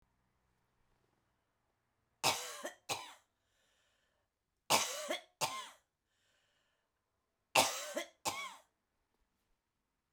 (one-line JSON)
{"three_cough_length": "10.1 s", "three_cough_amplitude": 8350, "three_cough_signal_mean_std_ratio": 0.29, "survey_phase": "beta (2021-08-13 to 2022-03-07)", "age": "65+", "gender": "Female", "wearing_mask": "No", "symptom_cough_any": true, "symptom_runny_or_blocked_nose": true, "symptom_sore_throat": true, "symptom_abdominal_pain": true, "symptom_fatigue": true, "symptom_fever_high_temperature": true, "symptom_headache": true, "symptom_onset": "3 days", "smoker_status": "Never smoked", "respiratory_condition_asthma": false, "respiratory_condition_other": false, "recruitment_source": "Test and Trace", "submission_delay": "1 day", "covid_test_result": "Positive", "covid_test_method": "RT-qPCR", "covid_ct_value": 18.6, "covid_ct_gene": "ORF1ab gene", "covid_ct_mean": 19.6, "covid_viral_load": "380000 copies/ml", "covid_viral_load_category": "Low viral load (10K-1M copies/ml)"}